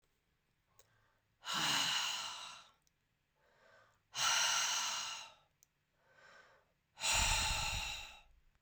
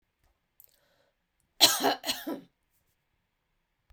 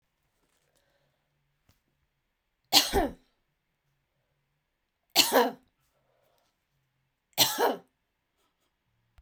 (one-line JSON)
{"exhalation_length": "8.6 s", "exhalation_amplitude": 2679, "exhalation_signal_mean_std_ratio": 0.52, "cough_length": "3.9 s", "cough_amplitude": 24588, "cough_signal_mean_std_ratio": 0.25, "three_cough_length": "9.2 s", "three_cough_amplitude": 22295, "three_cough_signal_mean_std_ratio": 0.24, "survey_phase": "beta (2021-08-13 to 2022-03-07)", "age": "45-64", "gender": "Female", "wearing_mask": "No", "symptom_none": true, "smoker_status": "Never smoked", "respiratory_condition_asthma": false, "respiratory_condition_other": false, "recruitment_source": "REACT", "submission_delay": "1 day", "covid_test_result": "Negative", "covid_test_method": "RT-qPCR"}